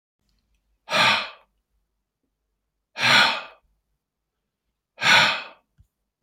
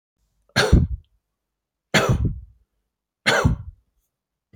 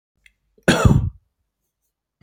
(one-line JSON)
{"exhalation_length": "6.2 s", "exhalation_amplitude": 23784, "exhalation_signal_mean_std_ratio": 0.34, "three_cough_length": "4.6 s", "three_cough_amplitude": 26241, "three_cough_signal_mean_std_ratio": 0.38, "cough_length": "2.2 s", "cough_amplitude": 28062, "cough_signal_mean_std_ratio": 0.32, "survey_phase": "beta (2021-08-13 to 2022-03-07)", "age": "65+", "gender": "Male", "wearing_mask": "No", "symptom_none": true, "smoker_status": "Never smoked", "respiratory_condition_asthma": false, "respiratory_condition_other": false, "recruitment_source": "REACT", "submission_delay": "8 days", "covid_test_result": "Negative", "covid_test_method": "RT-qPCR", "influenza_a_test_result": "Negative", "influenza_b_test_result": "Negative"}